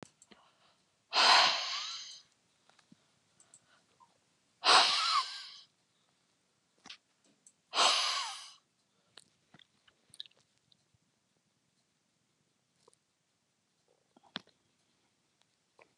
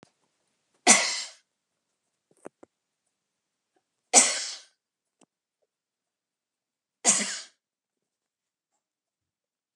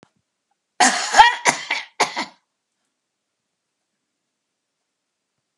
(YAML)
exhalation_length: 16.0 s
exhalation_amplitude: 12366
exhalation_signal_mean_std_ratio: 0.27
three_cough_length: 9.8 s
three_cough_amplitude: 26696
three_cough_signal_mean_std_ratio: 0.21
cough_length: 5.6 s
cough_amplitude: 32768
cough_signal_mean_std_ratio: 0.27
survey_phase: beta (2021-08-13 to 2022-03-07)
age: 65+
gender: Female
wearing_mask: 'No'
symptom_none: true
symptom_onset: 13 days
smoker_status: Ex-smoker
respiratory_condition_asthma: false
respiratory_condition_other: false
recruitment_source: REACT
submission_delay: 1 day
covid_test_result: Negative
covid_test_method: RT-qPCR
influenza_a_test_result: Unknown/Void
influenza_b_test_result: Unknown/Void